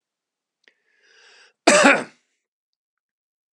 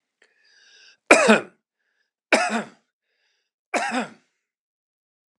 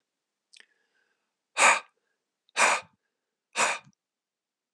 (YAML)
cough_length: 3.5 s
cough_amplitude: 32186
cough_signal_mean_std_ratio: 0.24
three_cough_length: 5.4 s
three_cough_amplitude: 32768
three_cough_signal_mean_std_ratio: 0.28
exhalation_length: 4.7 s
exhalation_amplitude: 18499
exhalation_signal_mean_std_ratio: 0.28
survey_phase: beta (2021-08-13 to 2022-03-07)
age: 45-64
gender: Male
wearing_mask: 'No'
symptom_none: true
smoker_status: Never smoked
respiratory_condition_asthma: false
respiratory_condition_other: false
recruitment_source: REACT
submission_delay: 3 days
covid_test_result: Negative
covid_test_method: RT-qPCR
influenza_a_test_result: Negative
influenza_b_test_result: Negative